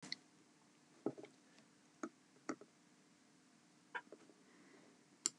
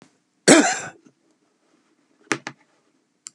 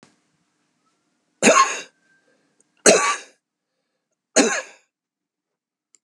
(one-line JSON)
{"exhalation_length": "5.4 s", "exhalation_amplitude": 4770, "exhalation_signal_mean_std_ratio": 0.29, "cough_length": "3.3 s", "cough_amplitude": 32497, "cough_signal_mean_std_ratio": 0.24, "three_cough_length": "6.0 s", "three_cough_amplitude": 32768, "three_cough_signal_mean_std_ratio": 0.29, "survey_phase": "beta (2021-08-13 to 2022-03-07)", "age": "65+", "gender": "Male", "wearing_mask": "No", "symptom_none": true, "smoker_status": "Never smoked", "respiratory_condition_asthma": false, "respiratory_condition_other": false, "recruitment_source": "REACT", "submission_delay": "2 days", "covid_test_result": "Negative", "covid_test_method": "RT-qPCR"}